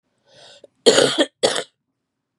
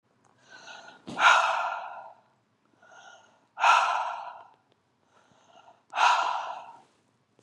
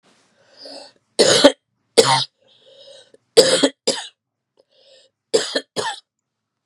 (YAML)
cough_length: 2.4 s
cough_amplitude: 32531
cough_signal_mean_std_ratio: 0.36
exhalation_length: 7.4 s
exhalation_amplitude: 14487
exhalation_signal_mean_std_ratio: 0.4
three_cough_length: 6.7 s
three_cough_amplitude: 32768
three_cough_signal_mean_std_ratio: 0.33
survey_phase: beta (2021-08-13 to 2022-03-07)
age: 45-64
gender: Female
wearing_mask: 'No'
symptom_runny_or_blocked_nose: true
symptom_other: true
symptom_onset: 2 days
smoker_status: Never smoked
respiratory_condition_asthma: false
respiratory_condition_other: false
recruitment_source: Test and Trace
submission_delay: 1 day
covid_test_result: Positive
covid_test_method: RT-qPCR
covid_ct_value: 18.9
covid_ct_gene: N gene